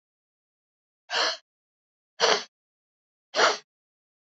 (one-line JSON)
{"exhalation_length": "4.4 s", "exhalation_amplitude": 14937, "exhalation_signal_mean_std_ratio": 0.29, "survey_phase": "beta (2021-08-13 to 2022-03-07)", "age": "18-44", "gender": "Female", "wearing_mask": "No", "symptom_cough_any": true, "symptom_runny_or_blocked_nose": true, "symptom_shortness_of_breath": true, "symptom_fatigue": true, "symptom_headache": true, "smoker_status": "Never smoked", "respiratory_condition_asthma": true, "respiratory_condition_other": true, "recruitment_source": "Test and Trace", "submission_delay": "2 days", "covid_test_result": "Positive", "covid_test_method": "RT-qPCR", "covid_ct_value": 31.6, "covid_ct_gene": "ORF1ab gene", "covid_ct_mean": 32.4, "covid_viral_load": "24 copies/ml", "covid_viral_load_category": "Minimal viral load (< 10K copies/ml)"}